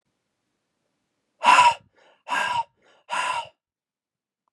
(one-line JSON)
{"exhalation_length": "4.5 s", "exhalation_amplitude": 24081, "exhalation_signal_mean_std_ratio": 0.33, "survey_phase": "beta (2021-08-13 to 2022-03-07)", "age": "18-44", "gender": "Male", "wearing_mask": "No", "symptom_cough_any": true, "symptom_new_continuous_cough": true, "symptom_runny_or_blocked_nose": true, "symptom_fatigue": true, "symptom_fever_high_temperature": true, "symptom_headache": true, "symptom_change_to_sense_of_smell_or_taste": true, "symptom_loss_of_taste": true, "symptom_other": true, "symptom_onset": "3 days", "smoker_status": "Never smoked", "respiratory_condition_asthma": false, "respiratory_condition_other": false, "recruitment_source": "Test and Trace", "submission_delay": "1 day", "covid_test_result": "Positive", "covid_test_method": "RT-qPCR", "covid_ct_value": 14.9, "covid_ct_gene": "ORF1ab gene", "covid_ct_mean": 15.4, "covid_viral_load": "9100000 copies/ml", "covid_viral_load_category": "High viral load (>1M copies/ml)"}